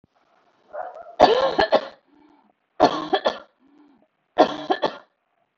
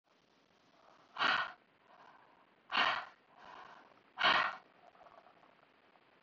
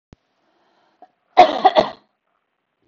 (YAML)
three_cough_length: 5.6 s
three_cough_amplitude: 30103
three_cough_signal_mean_std_ratio: 0.36
exhalation_length: 6.2 s
exhalation_amplitude: 4714
exhalation_signal_mean_std_ratio: 0.34
cough_length: 2.9 s
cough_amplitude: 31607
cough_signal_mean_std_ratio: 0.26
survey_phase: beta (2021-08-13 to 2022-03-07)
age: 45-64
gender: Female
wearing_mask: 'No'
symptom_none: true
symptom_onset: 2 days
smoker_status: Never smoked
respiratory_condition_asthma: false
respiratory_condition_other: false
recruitment_source: REACT
submission_delay: 0 days
covid_test_result: Negative
covid_test_method: RT-qPCR